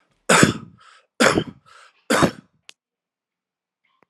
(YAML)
three_cough_length: 4.1 s
three_cough_amplitude: 31755
three_cough_signal_mean_std_ratio: 0.32
survey_phase: alpha (2021-03-01 to 2021-08-12)
age: 45-64
gender: Male
wearing_mask: 'No'
symptom_cough_any: true
symptom_fatigue: true
symptom_headache: true
symptom_onset: 3 days
smoker_status: Never smoked
respiratory_condition_asthma: false
respiratory_condition_other: false
recruitment_source: Test and Trace
submission_delay: 2 days
covid_test_result: Positive
covid_test_method: RT-qPCR
covid_ct_value: 15.8
covid_ct_gene: ORF1ab gene
covid_ct_mean: 16.3
covid_viral_load: 4400000 copies/ml
covid_viral_load_category: High viral load (>1M copies/ml)